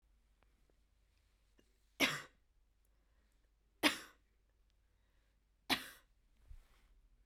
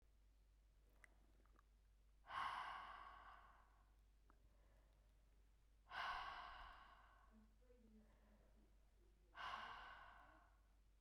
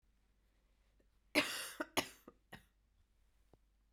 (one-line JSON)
{"three_cough_length": "7.3 s", "three_cough_amplitude": 6177, "three_cough_signal_mean_std_ratio": 0.21, "exhalation_length": "11.0 s", "exhalation_amplitude": 544, "exhalation_signal_mean_std_ratio": 0.55, "cough_length": "3.9 s", "cough_amplitude": 4447, "cough_signal_mean_std_ratio": 0.26, "survey_phase": "beta (2021-08-13 to 2022-03-07)", "age": "18-44", "gender": "Female", "wearing_mask": "No", "symptom_cough_any": true, "symptom_runny_or_blocked_nose": true, "symptom_fatigue": true, "symptom_fever_high_temperature": true, "symptom_headache": true, "symptom_loss_of_taste": true, "symptom_other": true, "symptom_onset": "2 days", "smoker_status": "Ex-smoker", "respiratory_condition_asthma": false, "respiratory_condition_other": false, "recruitment_source": "Test and Trace", "submission_delay": "2 days", "covid_test_result": "Positive", "covid_test_method": "RT-qPCR", "covid_ct_value": 25.2, "covid_ct_gene": "ORF1ab gene"}